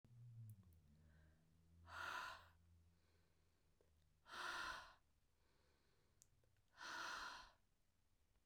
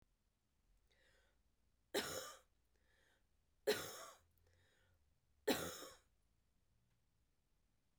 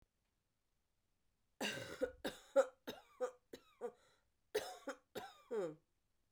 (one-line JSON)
{"exhalation_length": "8.5 s", "exhalation_amplitude": 392, "exhalation_signal_mean_std_ratio": 0.51, "three_cough_length": "8.0 s", "three_cough_amplitude": 2007, "three_cough_signal_mean_std_ratio": 0.27, "cough_length": "6.3 s", "cough_amplitude": 2569, "cough_signal_mean_std_ratio": 0.34, "survey_phase": "beta (2021-08-13 to 2022-03-07)", "age": "45-64", "gender": "Female", "wearing_mask": "No", "symptom_cough_any": true, "symptom_runny_or_blocked_nose": true, "symptom_shortness_of_breath": true, "symptom_sore_throat": true, "symptom_fatigue": true, "symptom_fever_high_temperature": true, "symptom_headache": true, "smoker_status": "Ex-smoker", "respiratory_condition_asthma": false, "respiratory_condition_other": false, "recruitment_source": "Test and Trace", "submission_delay": "2 days", "covid_test_result": "Positive", "covid_test_method": "RT-qPCR"}